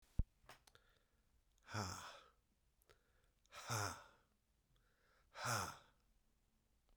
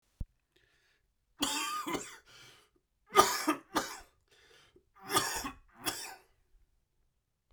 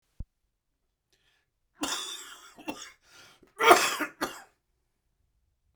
{"exhalation_length": "7.0 s", "exhalation_amplitude": 2052, "exhalation_signal_mean_std_ratio": 0.33, "three_cough_length": "7.5 s", "three_cough_amplitude": 14494, "three_cough_signal_mean_std_ratio": 0.35, "cough_length": "5.8 s", "cough_amplitude": 30319, "cough_signal_mean_std_ratio": 0.25, "survey_phase": "beta (2021-08-13 to 2022-03-07)", "age": "45-64", "gender": "Male", "wearing_mask": "No", "symptom_cough_any": true, "symptom_runny_or_blocked_nose": true, "symptom_shortness_of_breath": true, "symptom_sore_throat": true, "symptom_fatigue": true, "symptom_headache": true, "symptom_onset": "8 days", "smoker_status": "Never smoked", "respiratory_condition_asthma": false, "respiratory_condition_other": false, "recruitment_source": "REACT", "submission_delay": "0 days", "covid_test_result": "Negative", "covid_test_method": "RT-qPCR"}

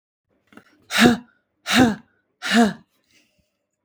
{"exhalation_length": "3.8 s", "exhalation_amplitude": 32630, "exhalation_signal_mean_std_ratio": 0.36, "survey_phase": "beta (2021-08-13 to 2022-03-07)", "age": "18-44", "gender": "Female", "wearing_mask": "No", "symptom_none": true, "smoker_status": "Current smoker (1 to 10 cigarettes per day)", "respiratory_condition_asthma": false, "respiratory_condition_other": false, "recruitment_source": "REACT", "submission_delay": "4 days", "covid_test_result": "Negative", "covid_test_method": "RT-qPCR", "influenza_a_test_result": "Negative", "influenza_b_test_result": "Negative"}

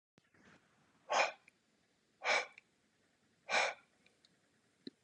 {"exhalation_length": "5.0 s", "exhalation_amplitude": 3949, "exhalation_signal_mean_std_ratio": 0.3, "survey_phase": "beta (2021-08-13 to 2022-03-07)", "age": "45-64", "gender": "Male", "wearing_mask": "No", "symptom_cough_any": true, "symptom_runny_or_blocked_nose": true, "symptom_onset": "6 days", "smoker_status": "Never smoked", "respiratory_condition_asthma": false, "respiratory_condition_other": false, "recruitment_source": "REACT", "submission_delay": "2 days", "covid_test_result": "Negative", "covid_test_method": "RT-qPCR", "influenza_a_test_result": "Negative", "influenza_b_test_result": "Negative"}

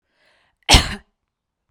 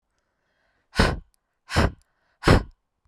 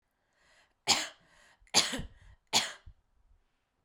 {"cough_length": "1.7 s", "cough_amplitude": 32768, "cough_signal_mean_std_ratio": 0.24, "exhalation_length": "3.1 s", "exhalation_amplitude": 23476, "exhalation_signal_mean_std_ratio": 0.31, "three_cough_length": "3.8 s", "three_cough_amplitude": 11931, "three_cough_signal_mean_std_ratio": 0.3, "survey_phase": "beta (2021-08-13 to 2022-03-07)", "age": "18-44", "gender": "Female", "wearing_mask": "No", "symptom_cough_any": true, "symptom_runny_or_blocked_nose": true, "smoker_status": "Never smoked", "respiratory_condition_asthma": false, "respiratory_condition_other": false, "recruitment_source": "REACT", "submission_delay": "1 day", "covid_test_result": "Negative", "covid_test_method": "RT-qPCR", "influenza_a_test_result": "Negative", "influenza_b_test_result": "Negative"}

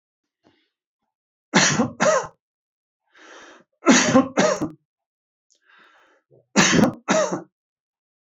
{"three_cough_length": "8.4 s", "three_cough_amplitude": 26323, "three_cough_signal_mean_std_ratio": 0.38, "survey_phase": "beta (2021-08-13 to 2022-03-07)", "age": "65+", "gender": "Male", "wearing_mask": "No", "symptom_none": true, "smoker_status": "Ex-smoker", "respiratory_condition_asthma": false, "respiratory_condition_other": false, "recruitment_source": "REACT", "submission_delay": "0 days", "covid_test_result": "Negative", "covid_test_method": "RT-qPCR", "influenza_a_test_result": "Negative", "influenza_b_test_result": "Negative"}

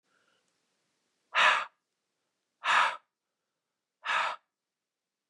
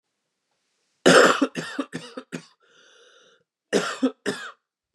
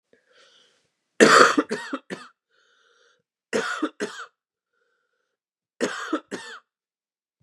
{"exhalation_length": "5.3 s", "exhalation_amplitude": 9308, "exhalation_signal_mean_std_ratio": 0.31, "cough_length": "4.9 s", "cough_amplitude": 30230, "cough_signal_mean_std_ratio": 0.32, "three_cough_length": "7.4 s", "three_cough_amplitude": 32546, "three_cough_signal_mean_std_ratio": 0.28, "survey_phase": "beta (2021-08-13 to 2022-03-07)", "age": "18-44", "gender": "Male", "wearing_mask": "No", "symptom_cough_any": true, "smoker_status": "Never smoked", "respiratory_condition_asthma": false, "respiratory_condition_other": false, "recruitment_source": "Test and Trace", "submission_delay": "2 days", "covid_test_result": "Positive", "covid_test_method": "RT-qPCR", "covid_ct_value": 25.2, "covid_ct_gene": "ORF1ab gene"}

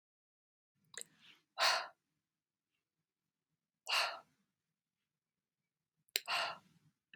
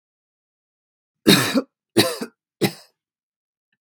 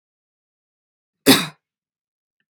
{"exhalation_length": "7.2 s", "exhalation_amplitude": 8291, "exhalation_signal_mean_std_ratio": 0.26, "three_cough_length": "3.8 s", "three_cough_amplitude": 32767, "three_cough_signal_mean_std_ratio": 0.29, "cough_length": "2.5 s", "cough_amplitude": 32767, "cough_signal_mean_std_ratio": 0.19, "survey_phase": "beta (2021-08-13 to 2022-03-07)", "age": "45-64", "gender": "Female", "wearing_mask": "No", "symptom_none": true, "smoker_status": "Ex-smoker", "respiratory_condition_asthma": false, "respiratory_condition_other": false, "recruitment_source": "REACT", "submission_delay": "2 days", "covid_test_result": "Negative", "covid_test_method": "RT-qPCR", "influenza_a_test_result": "Negative", "influenza_b_test_result": "Negative"}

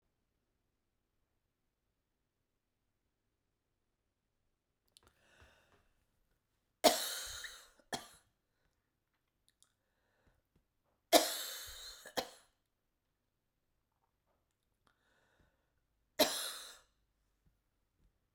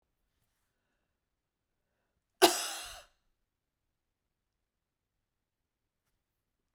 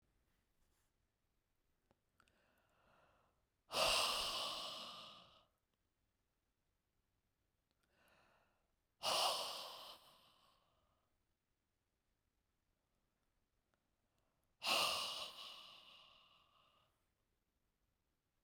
{"three_cough_length": "18.3 s", "three_cough_amplitude": 9638, "three_cough_signal_mean_std_ratio": 0.18, "cough_length": "6.7 s", "cough_amplitude": 17384, "cough_signal_mean_std_ratio": 0.14, "exhalation_length": "18.4 s", "exhalation_amplitude": 2105, "exhalation_signal_mean_std_ratio": 0.31, "survey_phase": "beta (2021-08-13 to 2022-03-07)", "age": "65+", "gender": "Female", "wearing_mask": "No", "symptom_none": true, "smoker_status": "Ex-smoker", "respiratory_condition_asthma": true, "respiratory_condition_other": false, "recruitment_source": "REACT", "submission_delay": "1 day", "covid_test_result": "Negative", "covid_test_method": "RT-qPCR"}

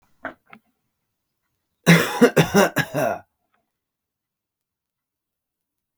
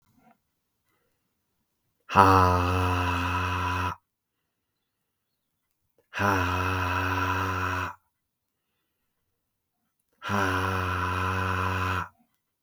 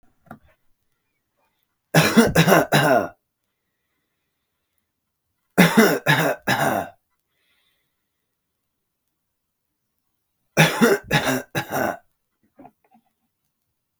{"cough_length": "6.0 s", "cough_amplitude": 32766, "cough_signal_mean_std_ratio": 0.29, "exhalation_length": "12.6 s", "exhalation_amplitude": 32495, "exhalation_signal_mean_std_ratio": 0.52, "three_cough_length": "14.0 s", "three_cough_amplitude": 32766, "three_cough_signal_mean_std_ratio": 0.35, "survey_phase": "beta (2021-08-13 to 2022-03-07)", "age": "18-44", "gender": "Male", "wearing_mask": "No", "symptom_runny_or_blocked_nose": true, "symptom_sore_throat": true, "smoker_status": "Never smoked", "respiratory_condition_asthma": false, "respiratory_condition_other": false, "recruitment_source": "REACT", "submission_delay": "2 days", "covid_test_result": "Positive", "covid_test_method": "RT-qPCR", "covid_ct_value": 36.3, "covid_ct_gene": "E gene", "influenza_a_test_result": "Negative", "influenza_b_test_result": "Negative"}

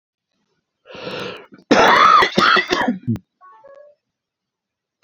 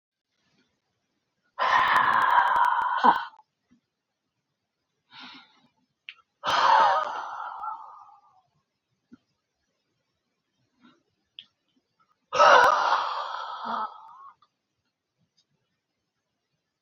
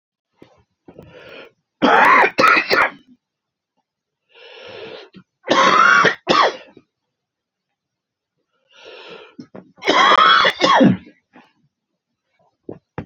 {"cough_length": "5.0 s", "cough_amplitude": 31554, "cough_signal_mean_std_ratio": 0.43, "exhalation_length": "16.8 s", "exhalation_amplitude": 19819, "exhalation_signal_mean_std_ratio": 0.37, "three_cough_length": "13.1 s", "three_cough_amplitude": 31546, "three_cough_signal_mean_std_ratio": 0.41, "survey_phase": "beta (2021-08-13 to 2022-03-07)", "age": "45-64", "gender": "Male", "wearing_mask": "No", "symptom_cough_any": true, "smoker_status": "Never smoked", "respiratory_condition_asthma": true, "respiratory_condition_other": false, "recruitment_source": "REACT", "submission_delay": "7 days", "covid_test_result": "Negative", "covid_test_method": "RT-qPCR", "influenza_a_test_result": "Negative", "influenza_b_test_result": "Negative"}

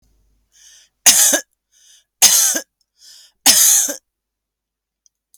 {"three_cough_length": "5.4 s", "three_cough_amplitude": 32768, "three_cough_signal_mean_std_ratio": 0.37, "survey_phase": "alpha (2021-03-01 to 2021-08-12)", "age": "45-64", "gender": "Female", "wearing_mask": "No", "symptom_none": true, "smoker_status": "Ex-smoker", "respiratory_condition_asthma": true, "respiratory_condition_other": false, "recruitment_source": "REACT", "submission_delay": "2 days", "covid_test_result": "Negative", "covid_test_method": "RT-qPCR"}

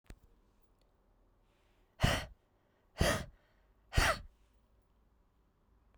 {"exhalation_length": "6.0 s", "exhalation_amplitude": 6055, "exhalation_signal_mean_std_ratio": 0.28, "survey_phase": "beta (2021-08-13 to 2022-03-07)", "age": "18-44", "gender": "Female", "wearing_mask": "No", "symptom_cough_any": true, "symptom_new_continuous_cough": true, "symptom_runny_or_blocked_nose": true, "symptom_headache": true, "symptom_other": true, "smoker_status": "Ex-smoker", "respiratory_condition_asthma": true, "respiratory_condition_other": false, "recruitment_source": "Test and Trace", "submission_delay": "2 days", "covid_test_result": "Positive", "covid_test_method": "ePCR"}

